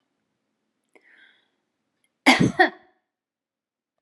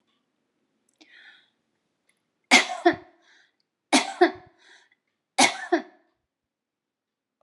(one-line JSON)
{"cough_length": "4.0 s", "cough_amplitude": 30259, "cough_signal_mean_std_ratio": 0.22, "three_cough_length": "7.4 s", "three_cough_amplitude": 32642, "three_cough_signal_mean_std_ratio": 0.24, "survey_phase": "beta (2021-08-13 to 2022-03-07)", "age": "65+", "gender": "Female", "wearing_mask": "No", "symptom_none": true, "smoker_status": "Ex-smoker", "respiratory_condition_asthma": false, "respiratory_condition_other": false, "recruitment_source": "REACT", "submission_delay": "3 days", "covid_test_result": "Negative", "covid_test_method": "RT-qPCR", "influenza_a_test_result": "Negative", "influenza_b_test_result": "Negative"}